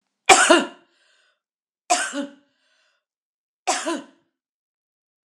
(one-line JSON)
{"three_cough_length": "5.3 s", "three_cough_amplitude": 32767, "three_cough_signal_mean_std_ratio": 0.28, "survey_phase": "alpha (2021-03-01 to 2021-08-12)", "age": "45-64", "gender": "Female", "wearing_mask": "No", "symptom_none": true, "smoker_status": "Never smoked", "respiratory_condition_asthma": true, "respiratory_condition_other": false, "recruitment_source": "REACT", "submission_delay": "1 day", "covid_test_result": "Negative", "covid_test_method": "RT-qPCR"}